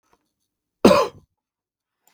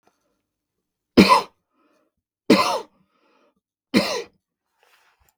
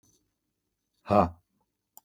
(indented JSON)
{
  "cough_length": "2.1 s",
  "cough_amplitude": 32768,
  "cough_signal_mean_std_ratio": 0.24,
  "three_cough_length": "5.4 s",
  "three_cough_amplitude": 32766,
  "three_cough_signal_mean_std_ratio": 0.27,
  "exhalation_length": "2.0 s",
  "exhalation_amplitude": 15526,
  "exhalation_signal_mean_std_ratio": 0.22,
  "survey_phase": "beta (2021-08-13 to 2022-03-07)",
  "age": "45-64",
  "gender": "Male",
  "wearing_mask": "No",
  "symptom_none": true,
  "symptom_onset": "12 days",
  "smoker_status": "Never smoked",
  "respiratory_condition_asthma": false,
  "respiratory_condition_other": false,
  "recruitment_source": "REACT",
  "submission_delay": "6 days",
  "covid_test_result": "Negative",
  "covid_test_method": "RT-qPCR"
}